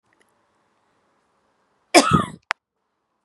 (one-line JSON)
{"cough_length": "3.2 s", "cough_amplitude": 32749, "cough_signal_mean_std_ratio": 0.22, "survey_phase": "beta (2021-08-13 to 2022-03-07)", "age": "18-44", "gender": "Female", "wearing_mask": "No", "symptom_none": true, "smoker_status": "Never smoked", "respiratory_condition_asthma": false, "respiratory_condition_other": false, "recruitment_source": "REACT", "submission_delay": "1 day", "covid_test_result": "Negative", "covid_test_method": "RT-qPCR"}